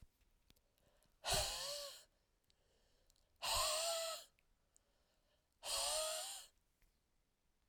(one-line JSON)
{"exhalation_length": "7.7 s", "exhalation_amplitude": 1745, "exhalation_signal_mean_std_ratio": 0.46, "survey_phase": "alpha (2021-03-01 to 2021-08-12)", "age": "45-64", "gender": "Female", "wearing_mask": "No", "symptom_none": true, "smoker_status": "Ex-smoker", "respiratory_condition_asthma": true, "respiratory_condition_other": false, "recruitment_source": "REACT", "submission_delay": "2 days", "covid_test_result": "Negative", "covid_test_method": "RT-qPCR"}